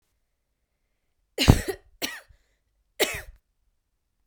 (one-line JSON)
{"three_cough_length": "4.3 s", "three_cough_amplitude": 32767, "three_cough_signal_mean_std_ratio": 0.22, "survey_phase": "beta (2021-08-13 to 2022-03-07)", "age": "18-44", "gender": "Female", "wearing_mask": "No", "symptom_other": true, "symptom_onset": "7 days", "smoker_status": "Ex-smoker", "respiratory_condition_asthma": true, "respiratory_condition_other": false, "recruitment_source": "REACT", "submission_delay": "1 day", "covid_test_result": "Negative", "covid_test_method": "RT-qPCR", "influenza_a_test_result": "Unknown/Void", "influenza_b_test_result": "Unknown/Void"}